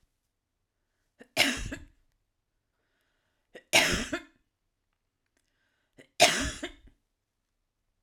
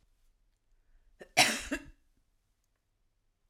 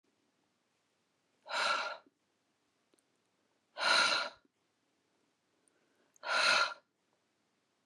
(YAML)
three_cough_length: 8.0 s
three_cough_amplitude: 22784
three_cough_signal_mean_std_ratio: 0.26
cough_length: 3.5 s
cough_amplitude: 14593
cough_signal_mean_std_ratio: 0.22
exhalation_length: 7.9 s
exhalation_amplitude: 5621
exhalation_signal_mean_std_ratio: 0.34
survey_phase: alpha (2021-03-01 to 2021-08-12)
age: 45-64
gender: Female
wearing_mask: 'No'
symptom_headache: true
symptom_onset: 12 days
smoker_status: Ex-smoker
respiratory_condition_asthma: false
respiratory_condition_other: false
recruitment_source: REACT
submission_delay: 1 day
covid_test_result: Negative
covid_test_method: RT-qPCR